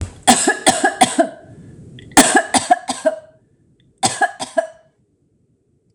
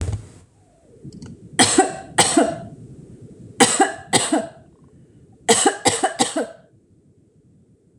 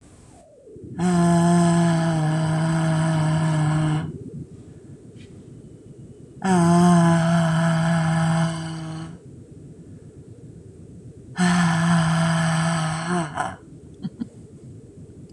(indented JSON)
{
  "cough_length": "5.9 s",
  "cough_amplitude": 26028,
  "cough_signal_mean_std_ratio": 0.42,
  "three_cough_length": "8.0 s",
  "three_cough_amplitude": 26028,
  "three_cough_signal_mean_std_ratio": 0.43,
  "exhalation_length": "15.3 s",
  "exhalation_amplitude": 14745,
  "exhalation_signal_mean_std_ratio": 0.78,
  "survey_phase": "beta (2021-08-13 to 2022-03-07)",
  "age": "45-64",
  "gender": "Female",
  "wearing_mask": "No",
  "symptom_none": true,
  "smoker_status": "Current smoker (e-cigarettes or vapes only)",
  "respiratory_condition_asthma": false,
  "respiratory_condition_other": false,
  "recruitment_source": "REACT",
  "submission_delay": "4 days",
  "covid_test_result": "Negative",
  "covid_test_method": "RT-qPCR",
  "influenza_a_test_result": "Negative",
  "influenza_b_test_result": "Negative"
}